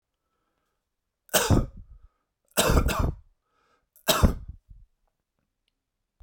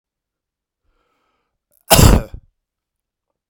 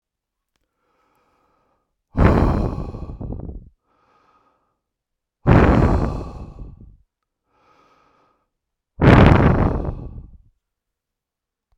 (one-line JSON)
{"three_cough_length": "6.2 s", "three_cough_amplitude": 18850, "three_cough_signal_mean_std_ratio": 0.34, "cough_length": "3.5 s", "cough_amplitude": 32768, "cough_signal_mean_std_ratio": 0.24, "exhalation_length": "11.8 s", "exhalation_amplitude": 32768, "exhalation_signal_mean_std_ratio": 0.36, "survey_phase": "beta (2021-08-13 to 2022-03-07)", "age": "45-64", "gender": "Male", "wearing_mask": "No", "symptom_cough_any": true, "symptom_runny_or_blocked_nose": true, "symptom_other": true, "symptom_onset": "5 days", "smoker_status": "Ex-smoker", "respiratory_condition_asthma": false, "respiratory_condition_other": false, "recruitment_source": "Test and Trace", "submission_delay": "2 days", "covid_test_result": "Positive", "covid_test_method": "RT-qPCR", "covid_ct_value": 20.7, "covid_ct_gene": "N gene"}